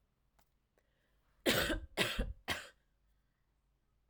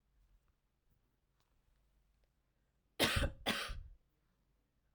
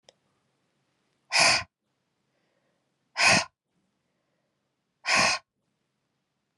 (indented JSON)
{
  "three_cough_length": "4.1 s",
  "three_cough_amplitude": 5562,
  "three_cough_signal_mean_std_ratio": 0.36,
  "cough_length": "4.9 s",
  "cough_amplitude": 4424,
  "cough_signal_mean_std_ratio": 0.29,
  "exhalation_length": "6.6 s",
  "exhalation_amplitude": 16310,
  "exhalation_signal_mean_std_ratio": 0.29,
  "survey_phase": "beta (2021-08-13 to 2022-03-07)",
  "age": "18-44",
  "gender": "Female",
  "wearing_mask": "No",
  "symptom_none": true,
  "symptom_onset": "6 days",
  "smoker_status": "Ex-smoker",
  "respiratory_condition_asthma": false,
  "respiratory_condition_other": false,
  "recruitment_source": "REACT",
  "submission_delay": "1 day",
  "covid_test_result": "Negative",
  "covid_test_method": "RT-qPCR"
}